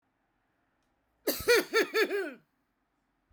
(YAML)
cough_length: 3.3 s
cough_amplitude: 7465
cough_signal_mean_std_ratio: 0.38
survey_phase: beta (2021-08-13 to 2022-03-07)
age: 45-64
gender: Female
wearing_mask: 'No'
symptom_none: true
smoker_status: Never smoked
respiratory_condition_asthma: false
respiratory_condition_other: false
recruitment_source: REACT
submission_delay: 3 days
covid_test_result: Negative
covid_test_method: RT-qPCR